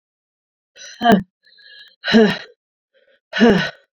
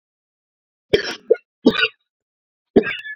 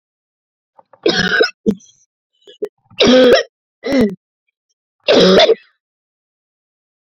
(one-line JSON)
{"exhalation_length": "3.9 s", "exhalation_amplitude": 29377, "exhalation_signal_mean_std_ratio": 0.37, "cough_length": "3.2 s", "cough_amplitude": 27549, "cough_signal_mean_std_ratio": 0.3, "three_cough_length": "7.2 s", "three_cough_amplitude": 29689, "three_cough_signal_mean_std_ratio": 0.41, "survey_phase": "beta (2021-08-13 to 2022-03-07)", "age": "45-64", "gender": "Female", "wearing_mask": "No", "symptom_cough_any": true, "symptom_new_continuous_cough": true, "symptom_runny_or_blocked_nose": true, "symptom_shortness_of_breath": true, "symptom_sore_throat": true, "symptom_fatigue": true, "symptom_fever_high_temperature": true, "symptom_headache": true, "symptom_change_to_sense_of_smell_or_taste": true, "symptom_loss_of_taste": true, "symptom_onset": "3 days", "smoker_status": "Current smoker (e-cigarettes or vapes only)", "respiratory_condition_asthma": false, "respiratory_condition_other": false, "recruitment_source": "Test and Trace", "submission_delay": "2 days", "covid_test_result": "Positive", "covid_test_method": "RT-qPCR"}